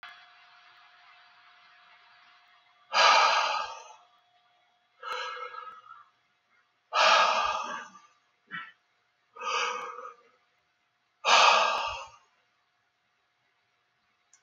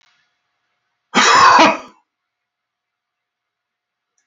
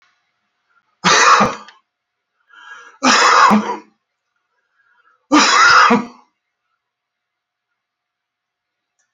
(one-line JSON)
{"exhalation_length": "14.4 s", "exhalation_amplitude": 16697, "exhalation_signal_mean_std_ratio": 0.36, "cough_length": "4.3 s", "cough_amplitude": 32540, "cough_signal_mean_std_ratio": 0.32, "three_cough_length": "9.1 s", "three_cough_amplitude": 32768, "three_cough_signal_mean_std_ratio": 0.39, "survey_phase": "alpha (2021-03-01 to 2021-08-12)", "age": "65+", "gender": "Male", "wearing_mask": "No", "symptom_none": true, "smoker_status": "Never smoked", "respiratory_condition_asthma": false, "respiratory_condition_other": false, "recruitment_source": "REACT", "submission_delay": "2 days", "covid_test_result": "Negative", "covid_test_method": "RT-qPCR"}